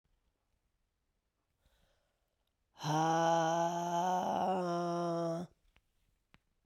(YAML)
exhalation_length: 6.7 s
exhalation_amplitude: 3599
exhalation_signal_mean_std_ratio: 0.58
survey_phase: beta (2021-08-13 to 2022-03-07)
age: 45-64
gender: Female
wearing_mask: 'No'
symptom_cough_any: true
symptom_runny_or_blocked_nose: true
symptom_shortness_of_breath: true
symptom_headache: true
symptom_change_to_sense_of_smell_or_taste: true
symptom_loss_of_taste: true
symptom_onset: 2 days
smoker_status: Never smoked
respiratory_condition_asthma: false
respiratory_condition_other: false
recruitment_source: Test and Trace
submission_delay: 1 day
covid_test_result: Positive
covid_test_method: RT-qPCR